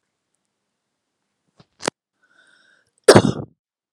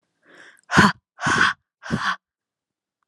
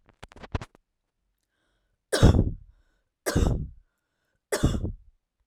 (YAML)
cough_length: 3.9 s
cough_amplitude: 32768
cough_signal_mean_std_ratio: 0.18
exhalation_length: 3.1 s
exhalation_amplitude: 32688
exhalation_signal_mean_std_ratio: 0.37
three_cough_length: 5.5 s
three_cough_amplitude: 16062
three_cough_signal_mean_std_ratio: 0.34
survey_phase: alpha (2021-03-01 to 2021-08-12)
age: 18-44
gender: Female
wearing_mask: 'No'
symptom_none: true
smoker_status: Never smoked
respiratory_condition_asthma: false
respiratory_condition_other: false
recruitment_source: REACT
submission_delay: 3 days
covid_test_result: Negative
covid_test_method: RT-qPCR